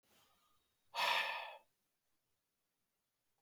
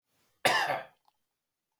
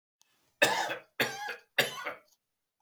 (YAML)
exhalation_length: 3.4 s
exhalation_amplitude: 2541
exhalation_signal_mean_std_ratio: 0.32
cough_length: 1.8 s
cough_amplitude: 8964
cough_signal_mean_std_ratio: 0.35
three_cough_length: 2.8 s
three_cough_amplitude: 10838
three_cough_signal_mean_std_ratio: 0.4
survey_phase: alpha (2021-03-01 to 2021-08-12)
age: 45-64
gender: Male
wearing_mask: 'No'
symptom_none: true
smoker_status: Never smoked
respiratory_condition_asthma: false
respiratory_condition_other: false
recruitment_source: REACT
submission_delay: 1 day
covid_test_result: Negative
covid_test_method: RT-qPCR